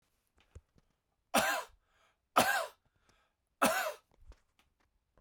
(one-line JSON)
{"three_cough_length": "5.2 s", "three_cough_amplitude": 8507, "three_cough_signal_mean_std_ratio": 0.32, "survey_phase": "beta (2021-08-13 to 2022-03-07)", "age": "45-64", "gender": "Male", "wearing_mask": "No", "symptom_cough_any": true, "symptom_runny_or_blocked_nose": true, "symptom_fatigue": true, "symptom_change_to_sense_of_smell_or_taste": true, "symptom_onset": "3 days", "smoker_status": "Ex-smoker", "respiratory_condition_asthma": false, "respiratory_condition_other": false, "recruitment_source": "Test and Trace", "submission_delay": "1 day", "covid_test_result": "Positive", "covid_test_method": "RT-qPCR"}